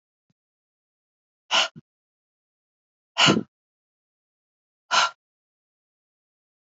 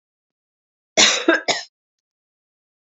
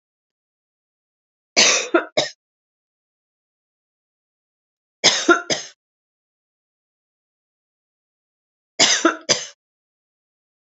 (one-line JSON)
{"exhalation_length": "6.7 s", "exhalation_amplitude": 19496, "exhalation_signal_mean_std_ratio": 0.22, "cough_length": "2.9 s", "cough_amplitude": 29821, "cough_signal_mean_std_ratio": 0.31, "three_cough_length": "10.7 s", "three_cough_amplitude": 32768, "three_cough_signal_mean_std_ratio": 0.26, "survey_phase": "beta (2021-08-13 to 2022-03-07)", "age": "45-64", "gender": "Female", "wearing_mask": "No", "symptom_none": true, "smoker_status": "Never smoked", "respiratory_condition_asthma": false, "respiratory_condition_other": false, "recruitment_source": "REACT", "submission_delay": "3 days", "covid_test_result": "Negative", "covid_test_method": "RT-qPCR", "influenza_a_test_result": "Negative", "influenza_b_test_result": "Negative"}